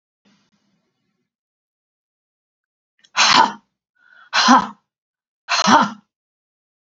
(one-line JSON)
{"exhalation_length": "7.0 s", "exhalation_amplitude": 29727, "exhalation_signal_mean_std_ratio": 0.3, "survey_phase": "beta (2021-08-13 to 2022-03-07)", "age": "65+", "gender": "Female", "wearing_mask": "No", "symptom_none": true, "smoker_status": "Never smoked", "respiratory_condition_asthma": false, "respiratory_condition_other": false, "recruitment_source": "REACT", "submission_delay": "3 days", "covid_test_result": "Negative", "covid_test_method": "RT-qPCR", "influenza_a_test_result": "Negative", "influenza_b_test_result": "Negative"}